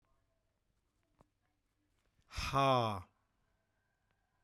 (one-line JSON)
{"exhalation_length": "4.4 s", "exhalation_amplitude": 3227, "exhalation_signal_mean_std_ratio": 0.3, "survey_phase": "beta (2021-08-13 to 2022-03-07)", "age": "45-64", "gender": "Male", "wearing_mask": "No", "symptom_none": true, "smoker_status": "Never smoked", "respiratory_condition_asthma": false, "respiratory_condition_other": false, "recruitment_source": "REACT", "submission_delay": "1 day", "covid_test_result": "Negative", "covid_test_method": "RT-qPCR"}